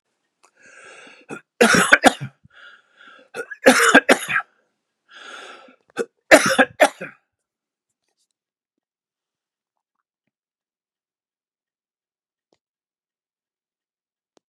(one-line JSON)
{"three_cough_length": "14.5 s", "three_cough_amplitude": 32768, "three_cough_signal_mean_std_ratio": 0.24, "survey_phase": "beta (2021-08-13 to 2022-03-07)", "age": "65+", "gender": "Male", "wearing_mask": "No", "symptom_none": true, "smoker_status": "Never smoked", "respiratory_condition_asthma": false, "respiratory_condition_other": false, "recruitment_source": "REACT", "submission_delay": "1 day", "covid_test_result": "Negative", "covid_test_method": "RT-qPCR", "influenza_a_test_result": "Negative", "influenza_b_test_result": "Negative"}